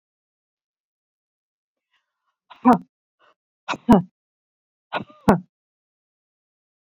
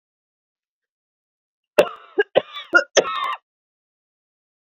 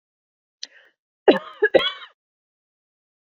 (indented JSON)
{
  "exhalation_length": "6.9 s",
  "exhalation_amplitude": 27992,
  "exhalation_signal_mean_std_ratio": 0.19,
  "three_cough_length": "4.8 s",
  "three_cough_amplitude": 31369,
  "three_cough_signal_mean_std_ratio": 0.25,
  "cough_length": "3.3 s",
  "cough_amplitude": 27501,
  "cough_signal_mean_std_ratio": 0.23,
  "survey_phase": "beta (2021-08-13 to 2022-03-07)",
  "age": "45-64",
  "gender": "Female",
  "wearing_mask": "No",
  "symptom_cough_any": true,
  "symptom_sore_throat": true,
  "symptom_other": true,
  "smoker_status": "Ex-smoker",
  "respiratory_condition_asthma": false,
  "respiratory_condition_other": false,
  "recruitment_source": "REACT",
  "submission_delay": "1 day",
  "covid_test_result": "Negative",
  "covid_test_method": "RT-qPCR"
}